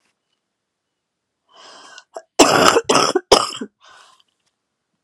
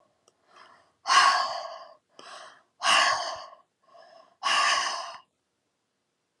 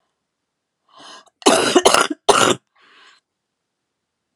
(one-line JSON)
{"three_cough_length": "5.0 s", "three_cough_amplitude": 32768, "three_cough_signal_mean_std_ratio": 0.32, "exhalation_length": "6.4 s", "exhalation_amplitude": 14844, "exhalation_signal_mean_std_ratio": 0.42, "cough_length": "4.4 s", "cough_amplitude": 32768, "cough_signal_mean_std_ratio": 0.33, "survey_phase": "alpha (2021-03-01 to 2021-08-12)", "age": "45-64", "gender": "Female", "wearing_mask": "No", "symptom_cough_any": true, "symptom_shortness_of_breath": true, "symptom_abdominal_pain": true, "symptom_fever_high_temperature": true, "symptom_headache": true, "smoker_status": "Never smoked", "respiratory_condition_asthma": true, "respiratory_condition_other": false, "recruitment_source": "Test and Trace", "submission_delay": "2 days", "covid_test_result": "Positive", "covid_test_method": "RT-qPCR", "covid_ct_value": 16.7, "covid_ct_gene": "ORF1ab gene", "covid_ct_mean": 17.4, "covid_viral_load": "2000000 copies/ml", "covid_viral_load_category": "High viral load (>1M copies/ml)"}